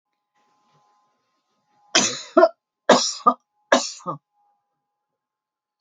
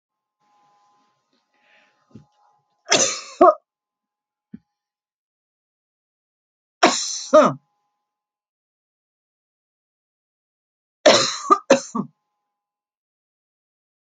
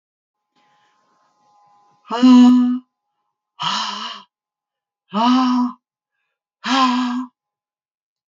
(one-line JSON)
{"cough_length": "5.8 s", "cough_amplitude": 31439, "cough_signal_mean_std_ratio": 0.27, "three_cough_length": "14.2 s", "three_cough_amplitude": 32767, "three_cough_signal_mean_std_ratio": 0.23, "exhalation_length": "8.3 s", "exhalation_amplitude": 25188, "exhalation_signal_mean_std_ratio": 0.41, "survey_phase": "alpha (2021-03-01 to 2021-08-12)", "age": "65+", "gender": "Female", "wearing_mask": "No", "symptom_none": true, "smoker_status": "Ex-smoker", "respiratory_condition_asthma": false, "respiratory_condition_other": false, "recruitment_source": "REACT", "submission_delay": "1 day", "covid_test_result": "Negative", "covid_test_method": "RT-qPCR"}